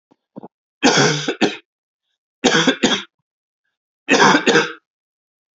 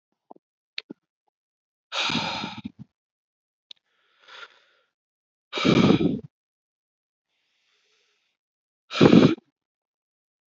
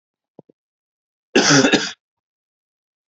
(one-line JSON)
{"three_cough_length": "5.5 s", "three_cough_amplitude": 30178, "three_cough_signal_mean_std_ratio": 0.43, "exhalation_length": "10.5 s", "exhalation_amplitude": 27132, "exhalation_signal_mean_std_ratio": 0.26, "cough_length": "3.1 s", "cough_amplitude": 28106, "cough_signal_mean_std_ratio": 0.32, "survey_phase": "beta (2021-08-13 to 2022-03-07)", "age": "18-44", "gender": "Male", "wearing_mask": "No", "symptom_cough_any": true, "symptom_runny_or_blocked_nose": true, "symptom_sore_throat": true, "symptom_fatigue": true, "symptom_fever_high_temperature": true, "symptom_headache": true, "symptom_onset": "3 days", "smoker_status": "Never smoked", "respiratory_condition_asthma": false, "respiratory_condition_other": false, "recruitment_source": "Test and Trace", "submission_delay": "1 day", "covid_test_result": "Positive", "covid_test_method": "RT-qPCR", "covid_ct_value": 20.9, "covid_ct_gene": "ORF1ab gene"}